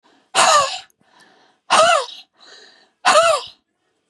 {"exhalation_length": "4.1 s", "exhalation_amplitude": 29429, "exhalation_signal_mean_std_ratio": 0.44, "survey_phase": "beta (2021-08-13 to 2022-03-07)", "age": "45-64", "gender": "Female", "wearing_mask": "No", "symptom_none": true, "smoker_status": "Never smoked", "respiratory_condition_asthma": true, "respiratory_condition_other": false, "recruitment_source": "REACT", "submission_delay": "1 day", "covid_test_result": "Negative", "covid_test_method": "RT-qPCR", "influenza_a_test_result": "Negative", "influenza_b_test_result": "Negative"}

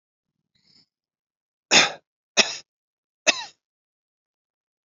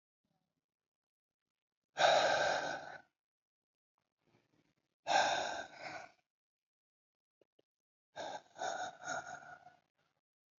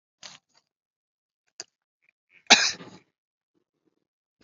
{"three_cough_length": "4.9 s", "three_cough_amplitude": 29502, "three_cough_signal_mean_std_ratio": 0.21, "exhalation_length": "10.6 s", "exhalation_amplitude": 5006, "exhalation_signal_mean_std_ratio": 0.34, "cough_length": "4.4 s", "cough_amplitude": 28674, "cough_signal_mean_std_ratio": 0.15, "survey_phase": "beta (2021-08-13 to 2022-03-07)", "age": "65+", "gender": "Male", "wearing_mask": "No", "symptom_runny_or_blocked_nose": true, "symptom_fever_high_temperature": true, "symptom_headache": true, "symptom_onset": "5 days", "smoker_status": "Never smoked", "respiratory_condition_asthma": false, "respiratory_condition_other": false, "recruitment_source": "Test and Trace", "submission_delay": "2 days", "covid_test_result": "Positive", "covid_test_method": "RT-qPCR"}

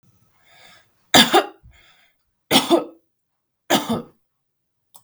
{"three_cough_length": "5.0 s", "three_cough_amplitude": 32768, "three_cough_signal_mean_std_ratio": 0.3, "survey_phase": "beta (2021-08-13 to 2022-03-07)", "age": "18-44", "gender": "Female", "wearing_mask": "No", "symptom_none": true, "smoker_status": "Never smoked", "respiratory_condition_asthma": false, "respiratory_condition_other": false, "recruitment_source": "REACT", "submission_delay": "2 days", "covid_test_result": "Negative", "covid_test_method": "RT-qPCR", "influenza_a_test_result": "Negative", "influenza_b_test_result": "Negative"}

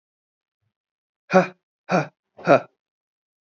{"exhalation_length": "3.4 s", "exhalation_amplitude": 26736, "exhalation_signal_mean_std_ratio": 0.25, "survey_phase": "beta (2021-08-13 to 2022-03-07)", "age": "18-44", "gender": "Male", "wearing_mask": "No", "symptom_runny_or_blocked_nose": true, "symptom_fatigue": true, "symptom_headache": true, "symptom_onset": "3 days", "smoker_status": "Never smoked", "respiratory_condition_asthma": false, "respiratory_condition_other": false, "recruitment_source": "Test and Trace", "submission_delay": "2 days", "covid_test_result": "Positive", "covid_test_method": "ePCR"}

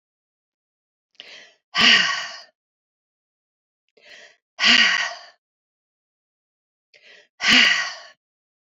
{"exhalation_length": "8.8 s", "exhalation_amplitude": 27400, "exhalation_signal_mean_std_ratio": 0.32, "survey_phase": "beta (2021-08-13 to 2022-03-07)", "age": "45-64", "gender": "Female", "wearing_mask": "No", "symptom_cough_any": true, "symptom_runny_or_blocked_nose": true, "symptom_fatigue": true, "symptom_headache": true, "symptom_onset": "5 days", "smoker_status": "Never smoked", "respiratory_condition_asthma": false, "respiratory_condition_other": false, "recruitment_source": "Test and Trace", "submission_delay": "3 days", "covid_test_result": "Positive", "covid_test_method": "RT-qPCR"}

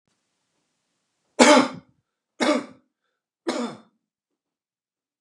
{"three_cough_length": "5.2 s", "three_cough_amplitude": 32767, "three_cough_signal_mean_std_ratio": 0.26, "survey_phase": "beta (2021-08-13 to 2022-03-07)", "age": "45-64", "gender": "Male", "wearing_mask": "No", "symptom_none": true, "smoker_status": "Never smoked", "respiratory_condition_asthma": false, "respiratory_condition_other": false, "recruitment_source": "REACT", "submission_delay": "3 days", "covid_test_result": "Negative", "covid_test_method": "RT-qPCR", "influenza_a_test_result": "Negative", "influenza_b_test_result": "Negative"}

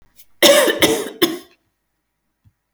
{"cough_length": "2.7 s", "cough_amplitude": 32768, "cough_signal_mean_std_ratio": 0.41, "survey_phase": "alpha (2021-03-01 to 2021-08-12)", "age": "45-64", "gender": "Female", "wearing_mask": "No", "symptom_none": true, "smoker_status": "Never smoked", "respiratory_condition_asthma": false, "respiratory_condition_other": false, "recruitment_source": "REACT", "submission_delay": "1 day", "covid_test_result": "Negative", "covid_test_method": "RT-qPCR"}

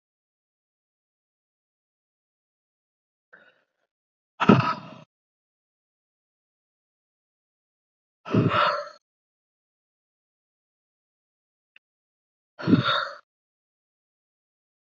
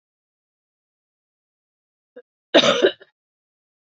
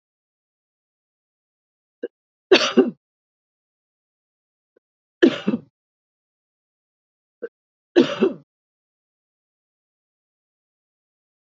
{"exhalation_length": "14.9 s", "exhalation_amplitude": 27259, "exhalation_signal_mean_std_ratio": 0.21, "cough_length": "3.8 s", "cough_amplitude": 27898, "cough_signal_mean_std_ratio": 0.22, "three_cough_length": "11.4 s", "three_cough_amplitude": 31429, "three_cough_signal_mean_std_ratio": 0.19, "survey_phase": "alpha (2021-03-01 to 2021-08-12)", "age": "18-44", "gender": "Female", "wearing_mask": "No", "symptom_cough_any": true, "symptom_shortness_of_breath": true, "symptom_diarrhoea": true, "symptom_fatigue": true, "symptom_fever_high_temperature": true, "symptom_headache": true, "symptom_change_to_sense_of_smell_or_taste": true, "symptom_loss_of_taste": true, "symptom_onset": "2 days", "smoker_status": "Never smoked", "respiratory_condition_asthma": false, "respiratory_condition_other": false, "recruitment_source": "Test and Trace", "submission_delay": "2 days", "covid_test_result": "Positive", "covid_test_method": "RT-qPCR", "covid_ct_value": 21.4, "covid_ct_gene": "ORF1ab gene", "covid_ct_mean": 22.2, "covid_viral_load": "52000 copies/ml", "covid_viral_load_category": "Low viral load (10K-1M copies/ml)"}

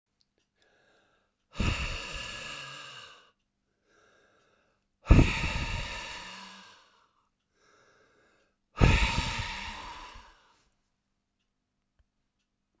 {"exhalation_length": "12.8 s", "exhalation_amplitude": 22117, "exhalation_signal_mean_std_ratio": 0.3, "survey_phase": "beta (2021-08-13 to 2022-03-07)", "age": "65+", "gender": "Male", "wearing_mask": "No", "symptom_cough_any": true, "symptom_runny_or_blocked_nose": true, "symptom_fatigue": true, "symptom_other": true, "symptom_onset": "3 days", "smoker_status": "Never smoked", "respiratory_condition_asthma": false, "respiratory_condition_other": false, "recruitment_source": "Test and Trace", "submission_delay": "2 days", "covid_test_result": "Positive", "covid_test_method": "LAMP"}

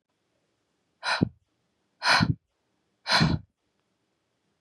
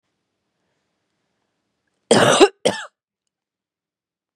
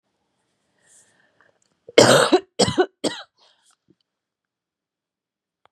{"exhalation_length": "4.6 s", "exhalation_amplitude": 13340, "exhalation_signal_mean_std_ratio": 0.32, "cough_length": "4.4 s", "cough_amplitude": 32767, "cough_signal_mean_std_ratio": 0.25, "three_cough_length": "5.7 s", "three_cough_amplitude": 32768, "three_cough_signal_mean_std_ratio": 0.26, "survey_phase": "beta (2021-08-13 to 2022-03-07)", "age": "18-44", "gender": "Female", "wearing_mask": "No", "symptom_cough_any": true, "symptom_runny_or_blocked_nose": true, "symptom_abdominal_pain": true, "symptom_diarrhoea": true, "symptom_fatigue": true, "symptom_headache": true, "symptom_onset": "5 days", "smoker_status": "Ex-smoker", "respiratory_condition_asthma": false, "respiratory_condition_other": false, "recruitment_source": "Test and Trace", "submission_delay": "2 days", "covid_test_result": "Positive", "covid_test_method": "RT-qPCR", "covid_ct_value": 19.2, "covid_ct_gene": "ORF1ab gene", "covid_ct_mean": 19.3, "covid_viral_load": "470000 copies/ml", "covid_viral_load_category": "Low viral load (10K-1M copies/ml)"}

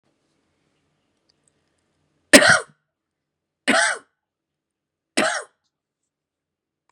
{"three_cough_length": "6.9 s", "three_cough_amplitude": 32768, "three_cough_signal_mean_std_ratio": 0.23, "survey_phase": "beta (2021-08-13 to 2022-03-07)", "age": "65+", "gender": "Female", "wearing_mask": "No", "symptom_none": true, "smoker_status": "Ex-smoker", "respiratory_condition_asthma": false, "respiratory_condition_other": false, "recruitment_source": "REACT", "submission_delay": "6 days", "covid_test_result": "Negative", "covid_test_method": "RT-qPCR", "influenza_a_test_result": "Unknown/Void", "influenza_b_test_result": "Unknown/Void"}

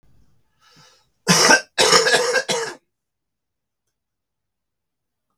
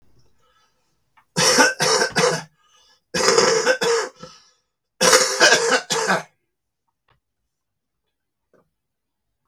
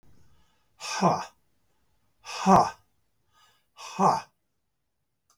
{"cough_length": "5.4 s", "cough_amplitude": 32768, "cough_signal_mean_std_ratio": 0.36, "three_cough_length": "9.5 s", "three_cough_amplitude": 32768, "three_cough_signal_mean_std_ratio": 0.45, "exhalation_length": "5.4 s", "exhalation_amplitude": 16142, "exhalation_signal_mean_std_ratio": 0.32, "survey_phase": "beta (2021-08-13 to 2022-03-07)", "age": "65+", "gender": "Male", "wearing_mask": "No", "symptom_cough_any": true, "symptom_runny_or_blocked_nose": true, "smoker_status": "Never smoked", "respiratory_condition_asthma": false, "respiratory_condition_other": true, "recruitment_source": "REACT", "submission_delay": "2 days", "covid_test_result": "Negative", "covid_test_method": "RT-qPCR", "influenza_a_test_result": "Unknown/Void", "influenza_b_test_result": "Unknown/Void"}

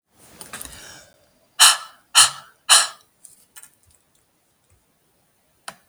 {"exhalation_length": "5.9 s", "exhalation_amplitude": 32768, "exhalation_signal_mean_std_ratio": 0.24, "survey_phase": "beta (2021-08-13 to 2022-03-07)", "age": "45-64", "gender": "Female", "wearing_mask": "No", "symptom_sore_throat": true, "symptom_onset": "13 days", "smoker_status": "Never smoked", "respiratory_condition_asthma": false, "respiratory_condition_other": false, "recruitment_source": "REACT", "submission_delay": "6 days", "covid_test_result": "Negative", "covid_test_method": "RT-qPCR", "influenza_a_test_result": "Negative", "influenza_b_test_result": "Negative"}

